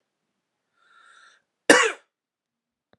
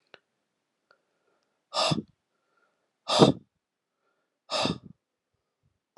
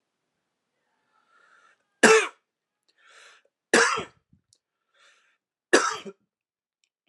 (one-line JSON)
{"cough_length": "3.0 s", "cough_amplitude": 32726, "cough_signal_mean_std_ratio": 0.2, "exhalation_length": "6.0 s", "exhalation_amplitude": 23568, "exhalation_signal_mean_std_ratio": 0.24, "three_cough_length": "7.1 s", "three_cough_amplitude": 25309, "three_cough_signal_mean_std_ratio": 0.24, "survey_phase": "beta (2021-08-13 to 2022-03-07)", "age": "18-44", "gender": "Male", "wearing_mask": "No", "symptom_cough_any": true, "symptom_runny_or_blocked_nose": true, "smoker_status": "Never smoked", "respiratory_condition_asthma": false, "respiratory_condition_other": false, "recruitment_source": "Test and Trace", "submission_delay": "2 days", "covid_test_result": "Positive", "covid_test_method": "LFT"}